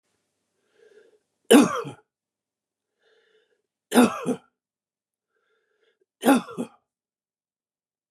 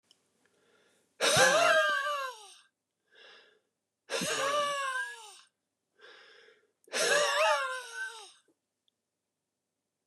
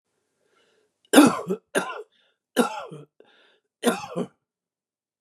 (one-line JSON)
{"three_cough_length": "8.1 s", "three_cough_amplitude": 26830, "three_cough_signal_mean_std_ratio": 0.23, "exhalation_length": "10.1 s", "exhalation_amplitude": 9906, "exhalation_signal_mean_std_ratio": 0.46, "cough_length": "5.2 s", "cough_amplitude": 31170, "cough_signal_mean_std_ratio": 0.29, "survey_phase": "beta (2021-08-13 to 2022-03-07)", "age": "65+", "gender": "Male", "wearing_mask": "No", "symptom_none": true, "smoker_status": "Ex-smoker", "respiratory_condition_asthma": false, "respiratory_condition_other": false, "recruitment_source": "REACT", "submission_delay": "1 day", "covid_test_result": "Negative", "covid_test_method": "RT-qPCR", "influenza_a_test_result": "Negative", "influenza_b_test_result": "Negative"}